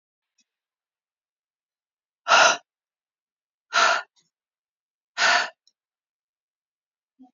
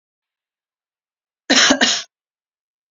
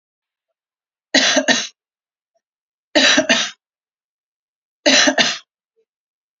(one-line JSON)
{"exhalation_length": "7.3 s", "exhalation_amplitude": 21749, "exhalation_signal_mean_std_ratio": 0.26, "cough_length": "2.9 s", "cough_amplitude": 32768, "cough_signal_mean_std_ratio": 0.31, "three_cough_length": "6.4 s", "three_cough_amplitude": 32768, "three_cough_signal_mean_std_ratio": 0.37, "survey_phase": "beta (2021-08-13 to 2022-03-07)", "age": "45-64", "gender": "Female", "wearing_mask": "No", "symptom_none": true, "smoker_status": "Never smoked", "respiratory_condition_asthma": false, "respiratory_condition_other": false, "recruitment_source": "REACT", "submission_delay": "1 day", "covid_test_result": "Negative", "covid_test_method": "RT-qPCR"}